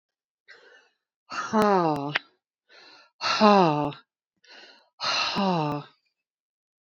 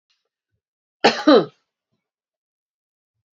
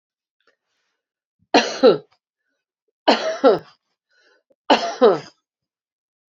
{
  "exhalation_length": "6.8 s",
  "exhalation_amplitude": 22581,
  "exhalation_signal_mean_std_ratio": 0.39,
  "cough_length": "3.3 s",
  "cough_amplitude": 32030,
  "cough_signal_mean_std_ratio": 0.23,
  "three_cough_length": "6.3 s",
  "three_cough_amplitude": 27674,
  "three_cough_signal_mean_std_ratio": 0.31,
  "survey_phase": "beta (2021-08-13 to 2022-03-07)",
  "age": "65+",
  "gender": "Female",
  "wearing_mask": "No",
  "symptom_new_continuous_cough": true,
  "symptom_headache": true,
  "symptom_other": true,
  "smoker_status": "Ex-smoker",
  "respiratory_condition_asthma": false,
  "respiratory_condition_other": false,
  "recruitment_source": "Test and Trace",
  "submission_delay": "1 day",
  "covid_test_result": "Positive",
  "covid_test_method": "RT-qPCR",
  "covid_ct_value": 22.1,
  "covid_ct_gene": "ORF1ab gene",
  "covid_ct_mean": 22.8,
  "covid_viral_load": "32000 copies/ml",
  "covid_viral_load_category": "Low viral load (10K-1M copies/ml)"
}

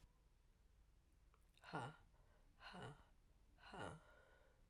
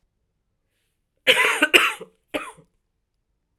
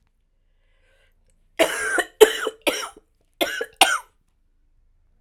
{
  "exhalation_length": "4.7 s",
  "exhalation_amplitude": 525,
  "exhalation_signal_mean_std_ratio": 0.53,
  "cough_length": "3.6 s",
  "cough_amplitude": 32767,
  "cough_signal_mean_std_ratio": 0.31,
  "three_cough_length": "5.2 s",
  "three_cough_amplitude": 32768,
  "three_cough_signal_mean_std_ratio": 0.3,
  "survey_phase": "beta (2021-08-13 to 2022-03-07)",
  "age": "45-64",
  "gender": "Female",
  "wearing_mask": "No",
  "symptom_cough_any": true,
  "symptom_new_continuous_cough": true,
  "symptom_runny_or_blocked_nose": true,
  "symptom_sore_throat": true,
  "symptom_fatigue": true,
  "symptom_fever_high_temperature": true,
  "symptom_headache": true,
  "symptom_onset": "3 days",
  "smoker_status": "Never smoked",
  "respiratory_condition_asthma": false,
  "respiratory_condition_other": false,
  "recruitment_source": "Test and Trace",
  "submission_delay": "1 day",
  "covid_test_result": "Positive",
  "covid_test_method": "RT-qPCR",
  "covid_ct_value": 17.7,
  "covid_ct_gene": "ORF1ab gene",
  "covid_ct_mean": 18.5,
  "covid_viral_load": "860000 copies/ml",
  "covid_viral_load_category": "Low viral load (10K-1M copies/ml)"
}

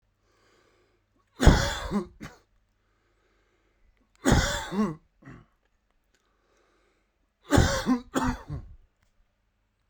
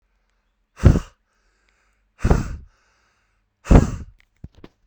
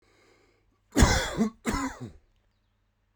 {
  "three_cough_length": "9.9 s",
  "three_cough_amplitude": 22904,
  "three_cough_signal_mean_std_ratio": 0.32,
  "exhalation_length": "4.9 s",
  "exhalation_amplitude": 32768,
  "exhalation_signal_mean_std_ratio": 0.26,
  "cough_length": "3.2 s",
  "cough_amplitude": 15649,
  "cough_signal_mean_std_ratio": 0.37,
  "survey_phase": "beta (2021-08-13 to 2022-03-07)",
  "age": "18-44",
  "gender": "Male",
  "wearing_mask": "No",
  "symptom_fatigue": true,
  "smoker_status": "Current smoker (1 to 10 cigarettes per day)",
  "respiratory_condition_asthma": false,
  "respiratory_condition_other": false,
  "recruitment_source": "REACT",
  "submission_delay": "2 days",
  "covid_test_result": "Negative",
  "covid_test_method": "RT-qPCR"
}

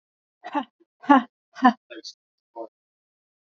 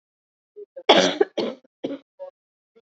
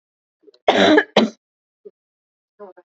{
  "exhalation_length": "3.6 s",
  "exhalation_amplitude": 26509,
  "exhalation_signal_mean_std_ratio": 0.24,
  "three_cough_length": "2.8 s",
  "three_cough_amplitude": 28702,
  "three_cough_signal_mean_std_ratio": 0.32,
  "cough_length": "2.9 s",
  "cough_amplitude": 28204,
  "cough_signal_mean_std_ratio": 0.33,
  "survey_phase": "alpha (2021-03-01 to 2021-08-12)",
  "age": "45-64",
  "gender": "Female",
  "wearing_mask": "No",
  "symptom_cough_any": true,
  "symptom_fatigue": true,
  "symptom_headache": true,
  "symptom_onset": "11 days",
  "smoker_status": "Ex-smoker",
  "respiratory_condition_asthma": false,
  "respiratory_condition_other": true,
  "recruitment_source": "REACT",
  "submission_delay": "1 day",
  "covid_test_result": "Negative",
  "covid_test_method": "RT-qPCR"
}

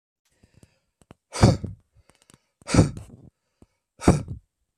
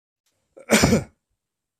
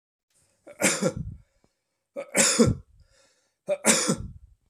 {
  "exhalation_length": "4.8 s",
  "exhalation_amplitude": 24090,
  "exhalation_signal_mean_std_ratio": 0.27,
  "cough_length": "1.8 s",
  "cough_amplitude": 25534,
  "cough_signal_mean_std_ratio": 0.33,
  "three_cough_length": "4.7 s",
  "three_cough_amplitude": 21519,
  "three_cough_signal_mean_std_ratio": 0.41,
  "survey_phase": "beta (2021-08-13 to 2022-03-07)",
  "age": "18-44",
  "gender": "Male",
  "wearing_mask": "No",
  "symptom_none": true,
  "smoker_status": "Never smoked",
  "respiratory_condition_asthma": false,
  "respiratory_condition_other": false,
  "recruitment_source": "REACT",
  "submission_delay": "2 days",
  "covid_test_result": "Negative",
  "covid_test_method": "RT-qPCR"
}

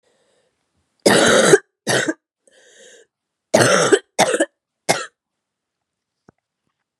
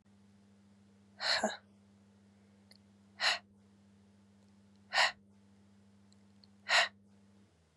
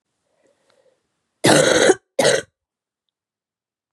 {
  "three_cough_length": "7.0 s",
  "three_cough_amplitude": 32768,
  "three_cough_signal_mean_std_ratio": 0.37,
  "exhalation_length": "7.8 s",
  "exhalation_amplitude": 6132,
  "exhalation_signal_mean_std_ratio": 0.3,
  "cough_length": "3.9 s",
  "cough_amplitude": 32767,
  "cough_signal_mean_std_ratio": 0.34,
  "survey_phase": "beta (2021-08-13 to 2022-03-07)",
  "age": "18-44",
  "gender": "Female",
  "wearing_mask": "No",
  "symptom_cough_any": true,
  "symptom_shortness_of_breath": true,
  "symptom_sore_throat": true,
  "symptom_abdominal_pain": true,
  "symptom_fatigue": true,
  "symptom_fever_high_temperature": true,
  "symptom_headache": true,
  "symptom_onset": "4 days",
  "smoker_status": "Never smoked",
  "respiratory_condition_asthma": false,
  "respiratory_condition_other": false,
  "recruitment_source": "Test and Trace",
  "submission_delay": "2 days",
  "covid_test_result": "Positive",
  "covid_test_method": "RT-qPCR",
  "covid_ct_value": 20.9,
  "covid_ct_gene": "ORF1ab gene",
  "covid_ct_mean": 21.4,
  "covid_viral_load": "93000 copies/ml",
  "covid_viral_load_category": "Low viral load (10K-1M copies/ml)"
}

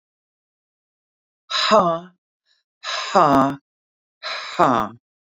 {
  "exhalation_length": "5.2 s",
  "exhalation_amplitude": 31662,
  "exhalation_signal_mean_std_ratio": 0.4,
  "survey_phase": "beta (2021-08-13 to 2022-03-07)",
  "age": "45-64",
  "gender": "Female",
  "wearing_mask": "No",
  "symptom_none": true,
  "smoker_status": "Never smoked",
  "respiratory_condition_asthma": false,
  "respiratory_condition_other": true,
  "recruitment_source": "REACT",
  "submission_delay": "3 days",
  "covid_test_result": "Negative",
  "covid_test_method": "RT-qPCR",
  "influenza_a_test_result": "Negative",
  "influenza_b_test_result": "Negative"
}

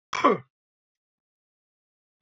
{
  "cough_length": "2.2 s",
  "cough_amplitude": 16925,
  "cough_signal_mean_std_ratio": 0.22,
  "survey_phase": "beta (2021-08-13 to 2022-03-07)",
  "age": "65+",
  "gender": "Male",
  "wearing_mask": "No",
  "symptom_cough_any": true,
  "symptom_runny_or_blocked_nose": true,
  "symptom_sore_throat": true,
  "symptom_fatigue": true,
  "symptom_fever_high_temperature": true,
  "symptom_onset": "2 days",
  "smoker_status": "Ex-smoker",
  "respiratory_condition_asthma": false,
  "respiratory_condition_other": false,
  "recruitment_source": "Test and Trace",
  "submission_delay": "1 day",
  "covid_test_result": "Positive",
  "covid_test_method": "RT-qPCR",
  "covid_ct_value": 16.5,
  "covid_ct_gene": "ORF1ab gene",
  "covid_ct_mean": 17.5,
  "covid_viral_load": "1800000 copies/ml",
  "covid_viral_load_category": "High viral load (>1M copies/ml)"
}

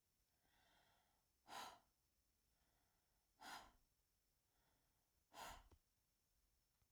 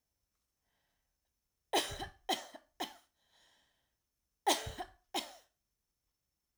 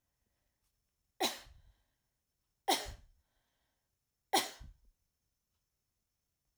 {
  "exhalation_length": "6.9 s",
  "exhalation_amplitude": 207,
  "exhalation_signal_mean_std_ratio": 0.37,
  "cough_length": "6.6 s",
  "cough_amplitude": 5387,
  "cough_signal_mean_std_ratio": 0.27,
  "three_cough_length": "6.6 s",
  "three_cough_amplitude": 5478,
  "three_cough_signal_mean_std_ratio": 0.22,
  "survey_phase": "alpha (2021-03-01 to 2021-08-12)",
  "age": "45-64",
  "gender": "Female",
  "wearing_mask": "No",
  "symptom_none": true,
  "smoker_status": "Never smoked",
  "respiratory_condition_asthma": false,
  "respiratory_condition_other": false,
  "recruitment_source": "REACT",
  "submission_delay": "1 day",
  "covid_test_result": "Negative",
  "covid_test_method": "RT-qPCR"
}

